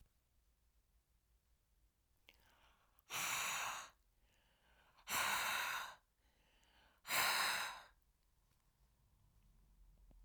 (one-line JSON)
{"exhalation_length": "10.2 s", "exhalation_amplitude": 2006, "exhalation_signal_mean_std_ratio": 0.41, "survey_phase": "alpha (2021-03-01 to 2021-08-12)", "age": "65+", "gender": "Female", "wearing_mask": "No", "symptom_none": true, "smoker_status": "Ex-smoker", "respiratory_condition_asthma": false, "respiratory_condition_other": false, "recruitment_source": "REACT", "submission_delay": "1 day", "covid_test_result": "Negative", "covid_test_method": "RT-qPCR"}